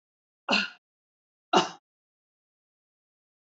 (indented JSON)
{
  "cough_length": "3.5 s",
  "cough_amplitude": 14648,
  "cough_signal_mean_std_ratio": 0.22,
  "survey_phase": "beta (2021-08-13 to 2022-03-07)",
  "age": "65+",
  "gender": "Female",
  "wearing_mask": "No",
  "symptom_fatigue": true,
  "smoker_status": "Never smoked",
  "respiratory_condition_asthma": false,
  "respiratory_condition_other": false,
  "recruitment_source": "REACT",
  "submission_delay": "1 day",
  "covid_test_result": "Negative",
  "covid_test_method": "RT-qPCR",
  "influenza_a_test_result": "Negative",
  "influenza_b_test_result": "Negative"
}